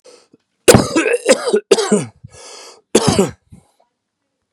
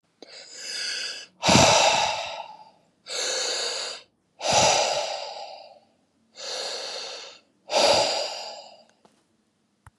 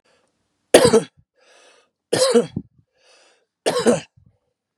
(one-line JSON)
{"cough_length": "4.5 s", "cough_amplitude": 32768, "cough_signal_mean_std_ratio": 0.42, "exhalation_length": "10.0 s", "exhalation_amplitude": 26916, "exhalation_signal_mean_std_ratio": 0.52, "three_cough_length": "4.8 s", "three_cough_amplitude": 32768, "three_cough_signal_mean_std_ratio": 0.33, "survey_phase": "beta (2021-08-13 to 2022-03-07)", "age": "45-64", "gender": "Male", "wearing_mask": "No", "symptom_none": true, "smoker_status": "Never smoked", "respiratory_condition_asthma": false, "respiratory_condition_other": false, "recruitment_source": "REACT", "submission_delay": "1 day", "covid_test_result": "Negative", "covid_test_method": "RT-qPCR", "influenza_a_test_result": "Negative", "influenza_b_test_result": "Negative"}